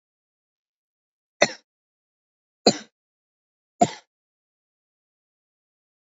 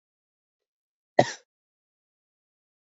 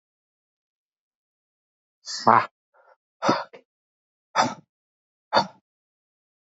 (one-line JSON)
{"three_cough_length": "6.1 s", "three_cough_amplitude": 27152, "three_cough_signal_mean_std_ratio": 0.13, "cough_length": "2.9 s", "cough_amplitude": 26057, "cough_signal_mean_std_ratio": 0.11, "exhalation_length": "6.5 s", "exhalation_amplitude": 27299, "exhalation_signal_mean_std_ratio": 0.23, "survey_phase": "alpha (2021-03-01 to 2021-08-12)", "age": "18-44", "gender": "Male", "wearing_mask": "No", "symptom_cough_any": true, "symptom_fatigue": true, "symptom_fever_high_temperature": true, "symptom_change_to_sense_of_smell_or_taste": true, "symptom_loss_of_taste": true, "symptom_onset": "4 days", "smoker_status": "Never smoked", "respiratory_condition_asthma": false, "respiratory_condition_other": false, "recruitment_source": "Test and Trace", "submission_delay": "2 days", "covid_test_result": "Positive", "covid_test_method": "RT-qPCR", "covid_ct_value": 14.7, "covid_ct_gene": "ORF1ab gene", "covid_ct_mean": 14.8, "covid_viral_load": "14000000 copies/ml", "covid_viral_load_category": "High viral load (>1M copies/ml)"}